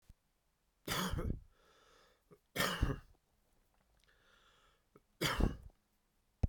{"three_cough_length": "6.5 s", "three_cough_amplitude": 4883, "three_cough_signal_mean_std_ratio": 0.35, "survey_phase": "beta (2021-08-13 to 2022-03-07)", "age": "65+", "gender": "Male", "wearing_mask": "No", "symptom_cough_any": true, "symptom_runny_or_blocked_nose": true, "symptom_sore_throat": true, "symptom_fatigue": true, "symptom_headache": true, "symptom_onset": "5 days", "smoker_status": "Never smoked", "respiratory_condition_asthma": false, "respiratory_condition_other": false, "recruitment_source": "Test and Trace", "submission_delay": "2 days", "covid_test_result": "Positive", "covid_test_method": "RT-qPCR", "covid_ct_value": 16.0, "covid_ct_gene": "ORF1ab gene", "covid_ct_mean": 16.3, "covid_viral_load": "4600000 copies/ml", "covid_viral_load_category": "High viral load (>1M copies/ml)"}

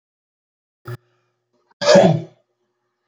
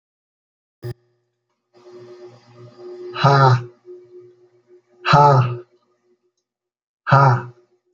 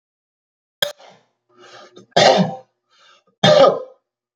{"cough_length": "3.1 s", "cough_amplitude": 28253, "cough_signal_mean_std_ratio": 0.28, "exhalation_length": "7.9 s", "exhalation_amplitude": 28116, "exhalation_signal_mean_std_ratio": 0.36, "three_cough_length": "4.4 s", "three_cough_amplitude": 29684, "three_cough_signal_mean_std_ratio": 0.34, "survey_phase": "beta (2021-08-13 to 2022-03-07)", "age": "45-64", "gender": "Male", "wearing_mask": "No", "symptom_none": true, "smoker_status": "Never smoked", "respiratory_condition_asthma": true, "respiratory_condition_other": false, "recruitment_source": "REACT", "submission_delay": "4 days", "covid_test_result": "Negative", "covid_test_method": "RT-qPCR"}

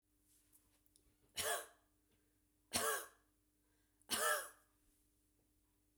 {"three_cough_length": "6.0 s", "three_cough_amplitude": 1976, "three_cough_signal_mean_std_ratio": 0.33, "survey_phase": "beta (2021-08-13 to 2022-03-07)", "age": "45-64", "gender": "Female", "wearing_mask": "No", "symptom_cough_any": true, "symptom_runny_or_blocked_nose": true, "symptom_headache": true, "smoker_status": "Never smoked", "respiratory_condition_asthma": false, "respiratory_condition_other": false, "recruitment_source": "Test and Trace", "submission_delay": "1 day", "covid_test_result": "Positive", "covid_test_method": "RT-qPCR", "covid_ct_value": 32.3, "covid_ct_gene": "ORF1ab gene", "covid_ct_mean": 34.6, "covid_viral_load": "4.5 copies/ml", "covid_viral_load_category": "Minimal viral load (< 10K copies/ml)"}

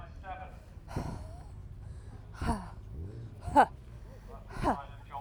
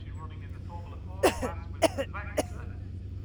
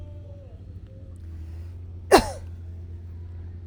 {"exhalation_length": "5.2 s", "exhalation_amplitude": 9812, "exhalation_signal_mean_std_ratio": 0.49, "three_cough_length": "3.2 s", "three_cough_amplitude": 13318, "three_cough_signal_mean_std_ratio": 0.68, "cough_length": "3.7 s", "cough_amplitude": 32767, "cough_signal_mean_std_ratio": 0.42, "survey_phase": "alpha (2021-03-01 to 2021-08-12)", "age": "45-64", "gender": "Female", "wearing_mask": "No", "symptom_none": true, "smoker_status": "Never smoked", "respiratory_condition_asthma": false, "respiratory_condition_other": false, "recruitment_source": "REACT", "submission_delay": "1 day", "covid_test_result": "Negative", "covid_test_method": "RT-qPCR"}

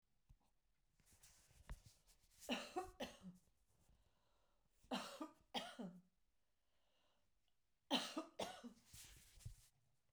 {"three_cough_length": "10.1 s", "three_cough_amplitude": 1456, "three_cough_signal_mean_std_ratio": 0.38, "survey_phase": "beta (2021-08-13 to 2022-03-07)", "age": "45-64", "gender": "Female", "wearing_mask": "No", "symptom_cough_any": true, "symptom_onset": "12 days", "smoker_status": "Ex-smoker", "respiratory_condition_asthma": false, "respiratory_condition_other": false, "recruitment_source": "REACT", "submission_delay": "1 day", "covid_test_result": "Negative", "covid_test_method": "RT-qPCR"}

